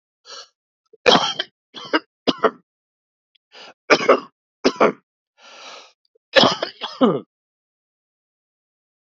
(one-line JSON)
{"three_cough_length": "9.1 s", "three_cough_amplitude": 32767, "three_cough_signal_mean_std_ratio": 0.3, "survey_phase": "beta (2021-08-13 to 2022-03-07)", "age": "45-64", "gender": "Male", "wearing_mask": "No", "symptom_cough_any": true, "symptom_runny_or_blocked_nose": true, "symptom_sore_throat": true, "symptom_diarrhoea": true, "symptom_fatigue": true, "symptom_fever_high_temperature": true, "symptom_headache": true, "symptom_loss_of_taste": true, "symptom_onset": "3 days", "smoker_status": "Never smoked", "respiratory_condition_asthma": false, "respiratory_condition_other": false, "recruitment_source": "Test and Trace", "submission_delay": "2 days", "covid_test_result": "Positive", "covid_test_method": "RT-qPCR"}